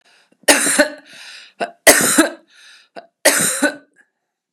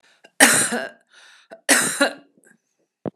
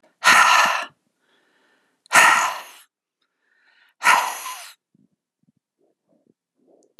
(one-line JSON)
{"three_cough_length": "4.5 s", "three_cough_amplitude": 32768, "three_cough_signal_mean_std_ratio": 0.42, "cough_length": "3.2 s", "cough_amplitude": 32768, "cough_signal_mean_std_ratio": 0.38, "exhalation_length": "7.0 s", "exhalation_amplitude": 32715, "exhalation_signal_mean_std_ratio": 0.35, "survey_phase": "beta (2021-08-13 to 2022-03-07)", "age": "45-64", "gender": "Female", "wearing_mask": "No", "symptom_none": true, "smoker_status": "Never smoked", "respiratory_condition_asthma": false, "respiratory_condition_other": false, "recruitment_source": "REACT", "submission_delay": "1 day", "covid_test_result": "Negative", "covid_test_method": "RT-qPCR", "influenza_a_test_result": "Unknown/Void", "influenza_b_test_result": "Unknown/Void"}